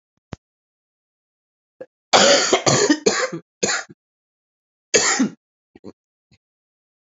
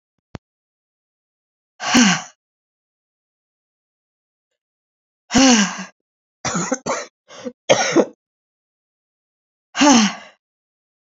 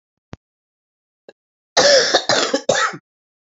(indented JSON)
{
  "cough_length": "7.1 s",
  "cough_amplitude": 31732,
  "cough_signal_mean_std_ratio": 0.37,
  "exhalation_length": "11.1 s",
  "exhalation_amplitude": 32767,
  "exhalation_signal_mean_std_ratio": 0.32,
  "three_cough_length": "3.5 s",
  "three_cough_amplitude": 31822,
  "three_cough_signal_mean_std_ratio": 0.42,
  "survey_phase": "beta (2021-08-13 to 2022-03-07)",
  "age": "65+",
  "gender": "Female",
  "wearing_mask": "No",
  "symptom_cough_any": true,
  "symptom_new_continuous_cough": true,
  "symptom_runny_or_blocked_nose": true,
  "symptom_abdominal_pain": true,
  "symptom_fever_high_temperature": true,
  "symptom_headache": true,
  "symptom_change_to_sense_of_smell_or_taste": true,
  "symptom_loss_of_taste": true,
  "symptom_onset": "6 days",
  "smoker_status": "Never smoked",
  "respiratory_condition_asthma": false,
  "respiratory_condition_other": false,
  "recruitment_source": "Test and Trace",
  "submission_delay": "3 days",
  "covid_test_result": "Positive",
  "covid_test_method": "ePCR"
}